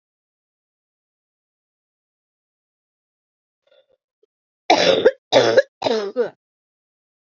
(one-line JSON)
{"three_cough_length": "7.3 s", "three_cough_amplitude": 29022, "three_cough_signal_mean_std_ratio": 0.28, "survey_phase": "beta (2021-08-13 to 2022-03-07)", "age": "18-44", "gender": "Female", "wearing_mask": "No", "symptom_cough_any": true, "symptom_new_continuous_cough": true, "symptom_runny_or_blocked_nose": true, "symptom_shortness_of_breath": true, "symptom_sore_throat": true, "symptom_abdominal_pain": true, "symptom_change_to_sense_of_smell_or_taste": true, "symptom_loss_of_taste": true, "smoker_status": "Never smoked", "respiratory_condition_asthma": false, "respiratory_condition_other": false, "recruitment_source": "Test and Trace", "submission_delay": "3 days", "covid_test_result": "Positive", "covid_test_method": "ePCR"}